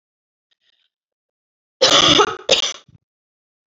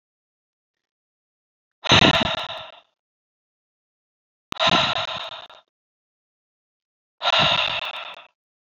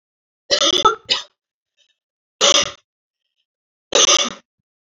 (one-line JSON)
{"cough_length": "3.7 s", "cough_amplitude": 31029, "cough_signal_mean_std_ratio": 0.34, "exhalation_length": "8.7 s", "exhalation_amplitude": 26645, "exhalation_signal_mean_std_ratio": 0.35, "three_cough_length": "4.9 s", "three_cough_amplitude": 30957, "three_cough_signal_mean_std_ratio": 0.36, "survey_phase": "alpha (2021-03-01 to 2021-08-12)", "age": "18-44", "gender": "Female", "wearing_mask": "No", "symptom_cough_any": true, "symptom_change_to_sense_of_smell_or_taste": true, "symptom_onset": "8 days", "smoker_status": "Ex-smoker", "respiratory_condition_asthma": false, "respiratory_condition_other": false, "recruitment_source": "Test and Trace", "submission_delay": "1 day", "covid_test_result": "Positive", "covid_test_method": "RT-qPCR", "covid_ct_value": 18.1, "covid_ct_gene": "ORF1ab gene", "covid_ct_mean": 18.9, "covid_viral_load": "650000 copies/ml", "covid_viral_load_category": "Low viral load (10K-1M copies/ml)"}